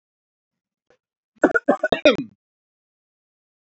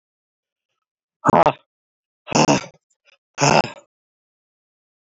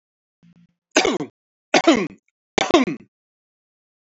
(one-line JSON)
{"cough_length": "3.7 s", "cough_amplitude": 26946, "cough_signal_mean_std_ratio": 0.24, "exhalation_length": "5.0 s", "exhalation_amplitude": 27727, "exhalation_signal_mean_std_ratio": 0.29, "three_cough_length": "4.0 s", "three_cough_amplitude": 27847, "three_cough_signal_mean_std_ratio": 0.33, "survey_phase": "beta (2021-08-13 to 2022-03-07)", "age": "45-64", "gender": "Male", "wearing_mask": "No", "symptom_none": true, "smoker_status": "Never smoked", "respiratory_condition_asthma": false, "respiratory_condition_other": false, "recruitment_source": "REACT", "submission_delay": "3 days", "covid_test_result": "Negative", "covid_test_method": "RT-qPCR", "influenza_a_test_result": "Negative", "influenza_b_test_result": "Negative"}